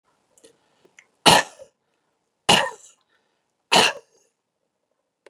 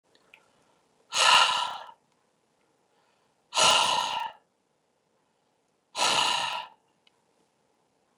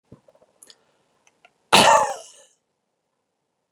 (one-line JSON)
{"three_cough_length": "5.3 s", "three_cough_amplitude": 32768, "three_cough_signal_mean_std_ratio": 0.24, "exhalation_length": "8.2 s", "exhalation_amplitude": 13720, "exhalation_signal_mean_std_ratio": 0.37, "cough_length": "3.7 s", "cough_amplitude": 28862, "cough_signal_mean_std_ratio": 0.25, "survey_phase": "beta (2021-08-13 to 2022-03-07)", "age": "45-64", "gender": "Male", "wearing_mask": "No", "symptom_none": true, "smoker_status": "Never smoked", "respiratory_condition_asthma": false, "respiratory_condition_other": false, "recruitment_source": "REACT", "submission_delay": "1 day", "covid_test_result": "Negative", "covid_test_method": "RT-qPCR", "influenza_a_test_result": "Unknown/Void", "influenza_b_test_result": "Unknown/Void"}